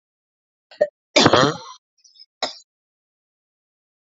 {
  "three_cough_length": "4.2 s",
  "three_cough_amplitude": 29322,
  "three_cough_signal_mean_std_ratio": 0.26,
  "survey_phase": "alpha (2021-03-01 to 2021-08-12)",
  "age": "45-64",
  "gender": "Female",
  "wearing_mask": "No",
  "symptom_cough_any": true,
  "symptom_fatigue": true,
  "symptom_fever_high_temperature": true,
  "symptom_onset": "3 days",
  "smoker_status": "Never smoked",
  "respiratory_condition_asthma": false,
  "respiratory_condition_other": false,
  "recruitment_source": "Test and Trace",
  "submission_delay": "2 days",
  "covid_test_result": "Positive",
  "covid_test_method": "RT-qPCR",
  "covid_ct_value": 22.4,
  "covid_ct_gene": "ORF1ab gene",
  "covid_ct_mean": 22.8,
  "covid_viral_load": "34000 copies/ml",
  "covid_viral_load_category": "Low viral load (10K-1M copies/ml)"
}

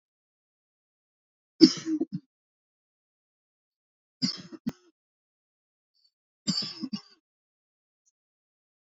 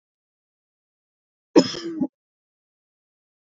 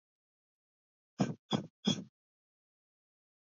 {
  "three_cough_length": "8.9 s",
  "three_cough_amplitude": 26812,
  "three_cough_signal_mean_std_ratio": 0.18,
  "cough_length": "3.4 s",
  "cough_amplitude": 27803,
  "cough_signal_mean_std_ratio": 0.19,
  "exhalation_length": "3.6 s",
  "exhalation_amplitude": 4278,
  "exhalation_signal_mean_std_ratio": 0.24,
  "survey_phase": "beta (2021-08-13 to 2022-03-07)",
  "age": "18-44",
  "gender": "Male",
  "wearing_mask": "No",
  "symptom_none": true,
  "smoker_status": "Ex-smoker",
  "respiratory_condition_asthma": false,
  "respiratory_condition_other": false,
  "recruitment_source": "REACT",
  "submission_delay": "2 days",
  "covid_test_result": "Negative",
  "covid_test_method": "RT-qPCR",
  "influenza_a_test_result": "Negative",
  "influenza_b_test_result": "Negative"
}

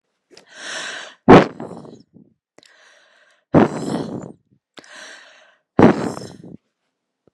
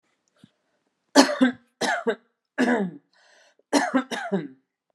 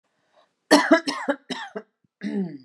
{
  "exhalation_length": "7.3 s",
  "exhalation_amplitude": 32768,
  "exhalation_signal_mean_std_ratio": 0.27,
  "three_cough_length": "4.9 s",
  "three_cough_amplitude": 30681,
  "three_cough_signal_mean_std_ratio": 0.4,
  "cough_length": "2.6 s",
  "cough_amplitude": 27137,
  "cough_signal_mean_std_ratio": 0.39,
  "survey_phase": "beta (2021-08-13 to 2022-03-07)",
  "age": "18-44",
  "gender": "Female",
  "wearing_mask": "No",
  "symptom_change_to_sense_of_smell_or_taste": true,
  "smoker_status": "Ex-smoker",
  "respiratory_condition_asthma": false,
  "respiratory_condition_other": false,
  "recruitment_source": "REACT",
  "submission_delay": "1 day",
  "covid_test_result": "Negative",
  "covid_test_method": "RT-qPCR"
}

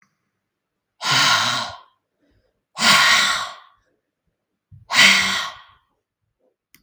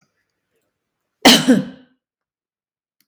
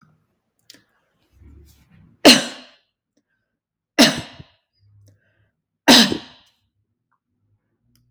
{
  "exhalation_length": "6.8 s",
  "exhalation_amplitude": 32768,
  "exhalation_signal_mean_std_ratio": 0.42,
  "cough_length": "3.1 s",
  "cough_amplitude": 32768,
  "cough_signal_mean_std_ratio": 0.26,
  "three_cough_length": "8.1 s",
  "three_cough_amplitude": 32768,
  "three_cough_signal_mean_std_ratio": 0.22,
  "survey_phase": "beta (2021-08-13 to 2022-03-07)",
  "age": "65+",
  "gender": "Female",
  "wearing_mask": "No",
  "symptom_fatigue": true,
  "symptom_headache": true,
  "smoker_status": "Ex-smoker",
  "respiratory_condition_asthma": false,
  "respiratory_condition_other": false,
  "recruitment_source": "REACT",
  "submission_delay": "3 days",
  "covid_test_result": "Negative",
  "covid_test_method": "RT-qPCR",
  "influenza_a_test_result": "Negative",
  "influenza_b_test_result": "Negative"
}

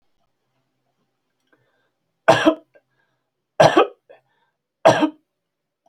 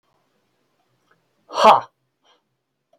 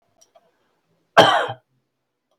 {
  "three_cough_length": "5.9 s",
  "three_cough_amplitude": 29338,
  "three_cough_signal_mean_std_ratio": 0.26,
  "exhalation_length": "3.0 s",
  "exhalation_amplitude": 31510,
  "exhalation_signal_mean_std_ratio": 0.21,
  "cough_length": "2.4 s",
  "cough_amplitude": 30392,
  "cough_signal_mean_std_ratio": 0.26,
  "survey_phase": "beta (2021-08-13 to 2022-03-07)",
  "age": "65+",
  "gender": "Male",
  "wearing_mask": "No",
  "symptom_none": true,
  "smoker_status": "Never smoked",
  "respiratory_condition_asthma": false,
  "respiratory_condition_other": false,
  "recruitment_source": "REACT",
  "submission_delay": "1 day",
  "covid_test_result": "Negative",
  "covid_test_method": "RT-qPCR"
}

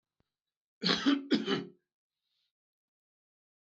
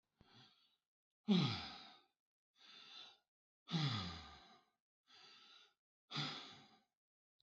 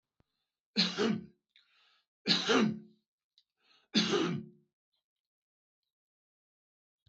{
  "cough_length": "3.7 s",
  "cough_amplitude": 7854,
  "cough_signal_mean_std_ratio": 0.33,
  "exhalation_length": "7.4 s",
  "exhalation_amplitude": 2057,
  "exhalation_signal_mean_std_ratio": 0.34,
  "three_cough_length": "7.1 s",
  "three_cough_amplitude": 8457,
  "three_cough_signal_mean_std_ratio": 0.35,
  "survey_phase": "beta (2021-08-13 to 2022-03-07)",
  "age": "65+",
  "gender": "Male",
  "wearing_mask": "No",
  "symptom_none": true,
  "smoker_status": "Ex-smoker",
  "respiratory_condition_asthma": false,
  "respiratory_condition_other": false,
  "recruitment_source": "REACT",
  "submission_delay": "2 days",
  "covid_test_result": "Negative",
  "covid_test_method": "RT-qPCR",
  "influenza_a_test_result": "Negative",
  "influenza_b_test_result": "Negative"
}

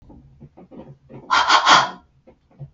{
  "exhalation_length": "2.7 s",
  "exhalation_amplitude": 32260,
  "exhalation_signal_mean_std_ratio": 0.39,
  "survey_phase": "beta (2021-08-13 to 2022-03-07)",
  "age": "18-44",
  "gender": "Female",
  "wearing_mask": "No",
  "symptom_none": true,
  "smoker_status": "Never smoked",
  "respiratory_condition_asthma": false,
  "respiratory_condition_other": false,
  "recruitment_source": "REACT",
  "submission_delay": "2 days",
  "covid_test_result": "Negative",
  "covid_test_method": "RT-qPCR",
  "influenza_a_test_result": "Negative",
  "influenza_b_test_result": "Negative"
}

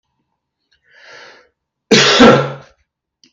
{
  "cough_length": "3.3 s",
  "cough_amplitude": 32768,
  "cough_signal_mean_std_ratio": 0.35,
  "survey_phase": "beta (2021-08-13 to 2022-03-07)",
  "age": "65+",
  "gender": "Male",
  "wearing_mask": "No",
  "symptom_cough_any": true,
  "symptom_sore_throat": true,
  "smoker_status": "Never smoked",
  "respiratory_condition_asthma": false,
  "respiratory_condition_other": false,
  "recruitment_source": "REACT",
  "submission_delay": "9 days",
  "covid_test_result": "Negative",
  "covid_test_method": "RT-qPCR",
  "influenza_a_test_result": "Negative",
  "influenza_b_test_result": "Negative"
}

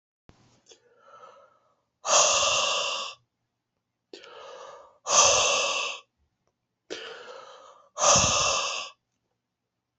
{
  "exhalation_length": "10.0 s",
  "exhalation_amplitude": 17860,
  "exhalation_signal_mean_std_ratio": 0.44,
  "survey_phase": "beta (2021-08-13 to 2022-03-07)",
  "age": "45-64",
  "gender": "Male",
  "wearing_mask": "No",
  "symptom_cough_any": true,
  "symptom_runny_or_blocked_nose": true,
  "symptom_sore_throat": true,
  "symptom_fatigue": true,
  "smoker_status": "Never smoked",
  "respiratory_condition_asthma": false,
  "respiratory_condition_other": false,
  "recruitment_source": "Test and Trace",
  "submission_delay": "2 days",
  "covid_test_result": "Positive",
  "covid_test_method": "ePCR"
}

